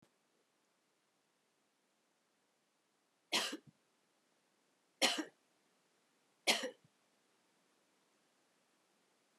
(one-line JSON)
{"three_cough_length": "9.4 s", "three_cough_amplitude": 4357, "three_cough_signal_mean_std_ratio": 0.2, "survey_phase": "beta (2021-08-13 to 2022-03-07)", "age": "65+", "gender": "Female", "wearing_mask": "No", "symptom_none": true, "symptom_onset": "5 days", "smoker_status": "Never smoked", "respiratory_condition_asthma": false, "respiratory_condition_other": false, "recruitment_source": "REACT", "submission_delay": "3 days", "covid_test_result": "Negative", "covid_test_method": "RT-qPCR", "influenza_a_test_result": "Negative", "influenza_b_test_result": "Negative"}